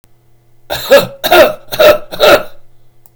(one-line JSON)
{"cough_length": "3.2 s", "cough_amplitude": 32768, "cough_signal_mean_std_ratio": 0.51, "survey_phase": "beta (2021-08-13 to 2022-03-07)", "age": "65+", "gender": "Male", "wearing_mask": "No", "symptom_none": true, "smoker_status": "Ex-smoker", "respiratory_condition_asthma": false, "respiratory_condition_other": false, "recruitment_source": "REACT", "submission_delay": "2 days", "covid_test_result": "Negative", "covid_test_method": "RT-qPCR", "influenza_a_test_result": "Negative", "influenza_b_test_result": "Negative"}